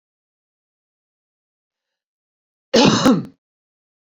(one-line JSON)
{"cough_length": "4.2 s", "cough_amplitude": 27668, "cough_signal_mean_std_ratio": 0.27, "survey_phase": "beta (2021-08-13 to 2022-03-07)", "age": "18-44", "gender": "Female", "wearing_mask": "No", "symptom_cough_any": true, "symptom_sore_throat": true, "symptom_fatigue": true, "symptom_fever_high_temperature": true, "symptom_headache": true, "symptom_onset": "3 days", "smoker_status": "Never smoked", "respiratory_condition_asthma": false, "respiratory_condition_other": false, "recruitment_source": "Test and Trace", "submission_delay": "2 days", "covid_test_result": "Positive", "covid_test_method": "RT-qPCR", "covid_ct_value": 16.3, "covid_ct_gene": "ORF1ab gene", "covid_ct_mean": 16.4, "covid_viral_load": "4300000 copies/ml", "covid_viral_load_category": "High viral load (>1M copies/ml)"}